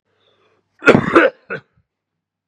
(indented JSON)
{
  "cough_length": "2.5 s",
  "cough_amplitude": 32768,
  "cough_signal_mean_std_ratio": 0.31,
  "survey_phase": "beta (2021-08-13 to 2022-03-07)",
  "age": "18-44",
  "gender": "Male",
  "wearing_mask": "No",
  "symptom_cough_any": true,
  "symptom_runny_or_blocked_nose": true,
  "symptom_shortness_of_breath": true,
  "symptom_fatigue": true,
  "symptom_headache": true,
  "symptom_change_to_sense_of_smell_or_taste": true,
  "smoker_status": "Never smoked",
  "respiratory_condition_asthma": false,
  "respiratory_condition_other": false,
  "recruitment_source": "Test and Trace",
  "submission_delay": "2 days",
  "covid_test_result": "Positive",
  "covid_test_method": "RT-qPCR",
  "covid_ct_value": 19.1,
  "covid_ct_gene": "ORF1ab gene",
  "covid_ct_mean": 19.7,
  "covid_viral_load": "350000 copies/ml",
  "covid_viral_load_category": "Low viral load (10K-1M copies/ml)"
}